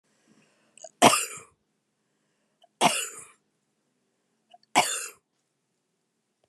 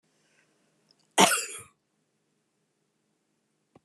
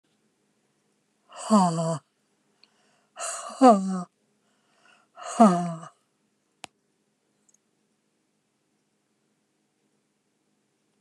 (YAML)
three_cough_length: 6.5 s
three_cough_amplitude: 25983
three_cough_signal_mean_std_ratio: 0.24
cough_length: 3.8 s
cough_amplitude: 26496
cough_signal_mean_std_ratio: 0.2
exhalation_length: 11.0 s
exhalation_amplitude: 19645
exhalation_signal_mean_std_ratio: 0.26
survey_phase: beta (2021-08-13 to 2022-03-07)
age: 65+
gender: Female
wearing_mask: 'No'
symptom_none: true
smoker_status: Never smoked
respiratory_condition_asthma: true
respiratory_condition_other: false
recruitment_source: REACT
submission_delay: 1 day
covid_test_result: Negative
covid_test_method: RT-qPCR